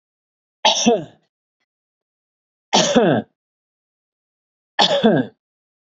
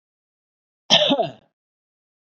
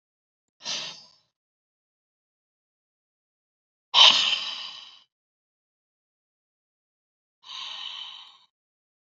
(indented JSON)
{
  "three_cough_length": "5.8 s",
  "three_cough_amplitude": 31212,
  "three_cough_signal_mean_std_ratio": 0.37,
  "cough_length": "2.3 s",
  "cough_amplitude": 26504,
  "cough_signal_mean_std_ratio": 0.31,
  "exhalation_length": "9.0 s",
  "exhalation_amplitude": 27701,
  "exhalation_signal_mean_std_ratio": 0.22,
  "survey_phase": "beta (2021-08-13 to 2022-03-07)",
  "age": "45-64",
  "gender": "Male",
  "wearing_mask": "No",
  "symptom_none": true,
  "smoker_status": "Never smoked",
  "respiratory_condition_asthma": false,
  "respiratory_condition_other": false,
  "recruitment_source": "REACT",
  "submission_delay": "1 day",
  "covid_test_result": "Negative",
  "covid_test_method": "RT-qPCR",
  "influenza_a_test_result": "Negative",
  "influenza_b_test_result": "Negative"
}